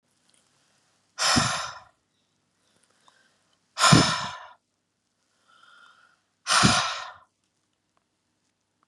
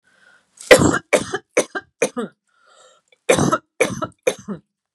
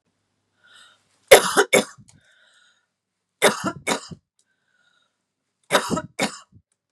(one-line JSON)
{"exhalation_length": "8.9 s", "exhalation_amplitude": 24857, "exhalation_signal_mean_std_ratio": 0.31, "cough_length": "4.9 s", "cough_amplitude": 32768, "cough_signal_mean_std_ratio": 0.36, "three_cough_length": "6.9 s", "three_cough_amplitude": 32768, "three_cough_signal_mean_std_ratio": 0.26, "survey_phase": "beta (2021-08-13 to 2022-03-07)", "age": "45-64", "gender": "Female", "wearing_mask": "No", "symptom_none": true, "smoker_status": "Ex-smoker", "respiratory_condition_asthma": false, "respiratory_condition_other": false, "recruitment_source": "REACT", "submission_delay": "1 day", "covid_test_result": "Negative", "covid_test_method": "RT-qPCR", "influenza_a_test_result": "Negative", "influenza_b_test_result": "Negative"}